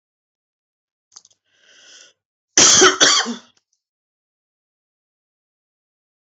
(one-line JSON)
{"cough_length": "6.2 s", "cough_amplitude": 32257, "cough_signal_mean_std_ratio": 0.26, "survey_phase": "beta (2021-08-13 to 2022-03-07)", "age": "65+", "gender": "Female", "wearing_mask": "No", "symptom_none": true, "symptom_onset": "8 days", "smoker_status": "Never smoked", "respiratory_condition_asthma": false, "respiratory_condition_other": false, "recruitment_source": "REACT", "submission_delay": "1 day", "covid_test_result": "Negative", "covid_test_method": "RT-qPCR", "influenza_a_test_result": "Negative", "influenza_b_test_result": "Negative"}